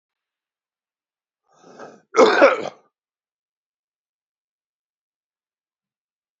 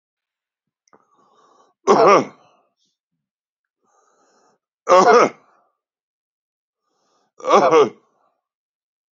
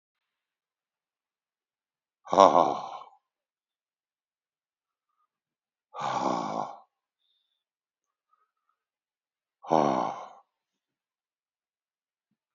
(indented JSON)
{
  "cough_length": "6.4 s",
  "cough_amplitude": 28460,
  "cough_signal_mean_std_ratio": 0.2,
  "three_cough_length": "9.1 s",
  "three_cough_amplitude": 29387,
  "three_cough_signal_mean_std_ratio": 0.29,
  "exhalation_length": "12.5 s",
  "exhalation_amplitude": 25380,
  "exhalation_signal_mean_std_ratio": 0.21,
  "survey_phase": "beta (2021-08-13 to 2022-03-07)",
  "age": "45-64",
  "gender": "Male",
  "wearing_mask": "No",
  "symptom_none": true,
  "smoker_status": "Current smoker (11 or more cigarettes per day)",
  "respiratory_condition_asthma": false,
  "respiratory_condition_other": false,
  "recruitment_source": "REACT",
  "submission_delay": "1 day",
  "covid_test_result": "Negative",
  "covid_test_method": "RT-qPCR",
  "influenza_a_test_result": "Negative",
  "influenza_b_test_result": "Negative"
}